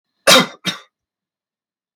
{"cough_length": "2.0 s", "cough_amplitude": 32768, "cough_signal_mean_std_ratio": 0.28, "survey_phase": "beta (2021-08-13 to 2022-03-07)", "age": "45-64", "gender": "Male", "wearing_mask": "No", "symptom_none": true, "smoker_status": "Never smoked", "respiratory_condition_asthma": false, "respiratory_condition_other": false, "recruitment_source": "REACT", "submission_delay": "2 days", "covid_test_result": "Negative", "covid_test_method": "RT-qPCR", "influenza_a_test_result": "Negative", "influenza_b_test_result": "Negative"}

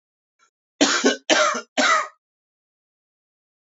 {"three_cough_length": "3.7 s", "three_cough_amplitude": 28110, "three_cough_signal_mean_std_ratio": 0.4, "survey_phase": "beta (2021-08-13 to 2022-03-07)", "age": "18-44", "gender": "Male", "wearing_mask": "No", "symptom_cough_any": true, "symptom_runny_or_blocked_nose": true, "symptom_sore_throat": true, "symptom_fatigue": true, "symptom_headache": true, "symptom_onset": "9 days", "smoker_status": "Never smoked", "respiratory_condition_asthma": false, "respiratory_condition_other": false, "recruitment_source": "Test and Trace", "submission_delay": "1 day", "covid_test_result": "Positive", "covid_test_method": "RT-qPCR", "covid_ct_value": 24.3, "covid_ct_gene": "ORF1ab gene", "covid_ct_mean": 24.7, "covid_viral_load": "7900 copies/ml", "covid_viral_load_category": "Minimal viral load (< 10K copies/ml)"}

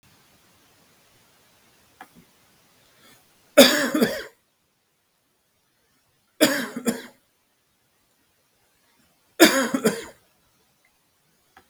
{"three_cough_length": "11.7 s", "three_cough_amplitude": 32768, "three_cough_signal_mean_std_ratio": 0.24, "survey_phase": "beta (2021-08-13 to 2022-03-07)", "age": "45-64", "gender": "Male", "wearing_mask": "No", "symptom_cough_any": true, "smoker_status": "Never smoked", "respiratory_condition_asthma": false, "respiratory_condition_other": false, "recruitment_source": "REACT", "submission_delay": "2 days", "covid_test_result": "Negative", "covid_test_method": "RT-qPCR", "influenza_a_test_result": "Negative", "influenza_b_test_result": "Negative"}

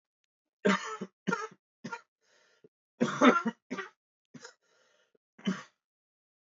{"three_cough_length": "6.5 s", "three_cough_amplitude": 12644, "three_cough_signal_mean_std_ratio": 0.29, "survey_phase": "beta (2021-08-13 to 2022-03-07)", "age": "18-44", "gender": "Male", "wearing_mask": "No", "symptom_cough_any": true, "symptom_runny_or_blocked_nose": true, "symptom_shortness_of_breath": true, "symptom_sore_throat": true, "symptom_abdominal_pain": true, "symptom_fatigue": true, "symptom_fever_high_temperature": true, "symptom_headache": true, "symptom_change_to_sense_of_smell_or_taste": true, "symptom_loss_of_taste": true, "symptom_onset": "5 days", "smoker_status": "Never smoked", "respiratory_condition_asthma": false, "respiratory_condition_other": false, "recruitment_source": "Test and Trace", "submission_delay": "1 day", "covid_test_result": "Positive", "covid_test_method": "RT-qPCR", "covid_ct_value": 18.5, "covid_ct_gene": "ORF1ab gene", "covid_ct_mean": 19.6, "covid_viral_load": "380000 copies/ml", "covid_viral_load_category": "Low viral load (10K-1M copies/ml)"}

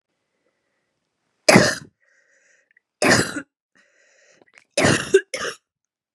{"three_cough_length": "6.1 s", "three_cough_amplitude": 32768, "three_cough_signal_mean_std_ratio": 0.3, "survey_phase": "beta (2021-08-13 to 2022-03-07)", "age": "45-64", "gender": "Female", "wearing_mask": "No", "symptom_cough_any": true, "symptom_fatigue": true, "symptom_headache": true, "symptom_loss_of_taste": true, "smoker_status": "Ex-smoker", "respiratory_condition_asthma": false, "respiratory_condition_other": false, "recruitment_source": "Test and Trace", "submission_delay": "2 days", "covid_test_result": "Positive", "covid_test_method": "ePCR"}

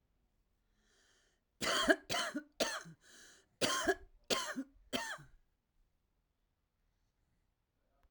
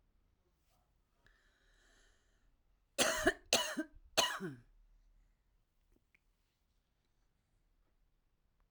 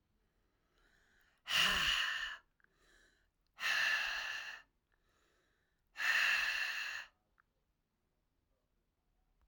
{"cough_length": "8.1 s", "cough_amplitude": 6850, "cough_signal_mean_std_ratio": 0.35, "three_cough_length": "8.7 s", "three_cough_amplitude": 5533, "three_cough_signal_mean_std_ratio": 0.25, "exhalation_length": "9.5 s", "exhalation_amplitude": 3679, "exhalation_signal_mean_std_ratio": 0.45, "survey_phase": "alpha (2021-03-01 to 2021-08-12)", "age": "45-64", "gender": "Female", "wearing_mask": "No", "symptom_cough_any": true, "symptom_diarrhoea": true, "symptom_fatigue": true, "symptom_headache": true, "symptom_change_to_sense_of_smell_or_taste": true, "smoker_status": "Current smoker (1 to 10 cigarettes per day)", "respiratory_condition_asthma": false, "respiratory_condition_other": false, "recruitment_source": "Test and Trace", "submission_delay": "1 day", "covid_test_result": "Positive", "covid_test_method": "RT-qPCR", "covid_ct_value": 34.4, "covid_ct_gene": "ORF1ab gene", "covid_ct_mean": 35.0, "covid_viral_load": "3.4 copies/ml", "covid_viral_load_category": "Minimal viral load (< 10K copies/ml)"}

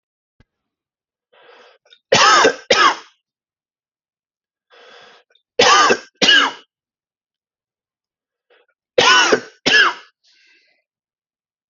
{"three_cough_length": "11.7 s", "three_cough_amplitude": 32705, "three_cough_signal_mean_std_ratio": 0.34, "survey_phase": "alpha (2021-03-01 to 2021-08-12)", "age": "45-64", "gender": "Male", "wearing_mask": "No", "symptom_none": true, "smoker_status": "Ex-smoker", "respiratory_condition_asthma": false, "respiratory_condition_other": false, "recruitment_source": "REACT", "submission_delay": "2 days", "covid_test_result": "Negative", "covid_test_method": "RT-qPCR"}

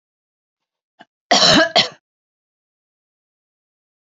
{"cough_length": "4.2 s", "cough_amplitude": 30612, "cough_signal_mean_std_ratio": 0.27, "survey_phase": "beta (2021-08-13 to 2022-03-07)", "age": "45-64", "gender": "Female", "wearing_mask": "No", "symptom_none": true, "smoker_status": "Never smoked", "respiratory_condition_asthma": false, "respiratory_condition_other": false, "recruitment_source": "Test and Trace", "submission_delay": "1 day", "covid_test_result": "Negative", "covid_test_method": "RT-qPCR"}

